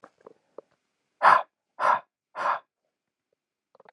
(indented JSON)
{
  "exhalation_length": "3.9 s",
  "exhalation_amplitude": 19084,
  "exhalation_signal_mean_std_ratio": 0.27,
  "survey_phase": "alpha (2021-03-01 to 2021-08-12)",
  "age": "18-44",
  "gender": "Male",
  "wearing_mask": "No",
  "symptom_cough_any": true,
  "symptom_fatigue": true,
  "smoker_status": "Ex-smoker",
  "respiratory_condition_asthma": false,
  "respiratory_condition_other": false,
  "recruitment_source": "Test and Trace",
  "submission_delay": "2 days",
  "covid_test_result": "Positive",
  "covid_test_method": "RT-qPCR",
  "covid_ct_value": 24.3,
  "covid_ct_gene": "N gene"
}